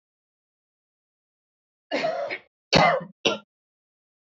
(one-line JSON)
{"cough_length": "4.4 s", "cough_amplitude": 22392, "cough_signal_mean_std_ratio": 0.32, "survey_phase": "beta (2021-08-13 to 2022-03-07)", "age": "45-64", "gender": "Female", "wearing_mask": "No", "symptom_runny_or_blocked_nose": true, "smoker_status": "Never smoked", "respiratory_condition_asthma": true, "respiratory_condition_other": false, "recruitment_source": "REACT", "submission_delay": "1 day", "covid_test_result": "Negative", "covid_test_method": "RT-qPCR", "influenza_a_test_result": "Unknown/Void", "influenza_b_test_result": "Unknown/Void"}